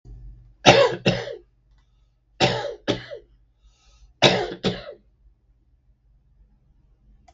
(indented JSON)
{
  "three_cough_length": "7.3 s",
  "three_cough_amplitude": 32766,
  "three_cough_signal_mean_std_ratio": 0.32,
  "survey_phase": "beta (2021-08-13 to 2022-03-07)",
  "age": "65+",
  "gender": "Male",
  "wearing_mask": "No",
  "symptom_none": true,
  "smoker_status": "Ex-smoker",
  "respiratory_condition_asthma": false,
  "respiratory_condition_other": true,
  "recruitment_source": "REACT",
  "submission_delay": "4 days",
  "covid_test_result": "Negative",
  "covid_test_method": "RT-qPCR",
  "influenza_a_test_result": "Negative",
  "influenza_b_test_result": "Negative"
}